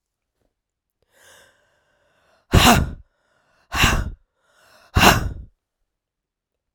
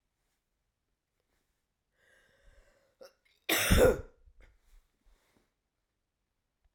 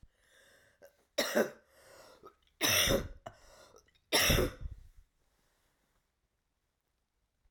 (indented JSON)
{
  "exhalation_length": "6.7 s",
  "exhalation_amplitude": 32768,
  "exhalation_signal_mean_std_ratio": 0.3,
  "cough_length": "6.7 s",
  "cough_amplitude": 9008,
  "cough_signal_mean_std_ratio": 0.22,
  "three_cough_length": "7.5 s",
  "three_cough_amplitude": 6017,
  "three_cough_signal_mean_std_ratio": 0.34,
  "survey_phase": "beta (2021-08-13 to 2022-03-07)",
  "age": "45-64",
  "gender": "Female",
  "wearing_mask": "No",
  "symptom_cough_any": true,
  "symptom_runny_or_blocked_nose": true,
  "symptom_sore_throat": true,
  "symptom_fatigue": true,
  "symptom_headache": true,
  "symptom_onset": "3 days",
  "smoker_status": "Never smoked",
  "respiratory_condition_asthma": false,
  "respiratory_condition_other": false,
  "recruitment_source": "REACT",
  "submission_delay": "1 day",
  "covid_test_result": "Negative",
  "covid_test_method": "RT-qPCR"
}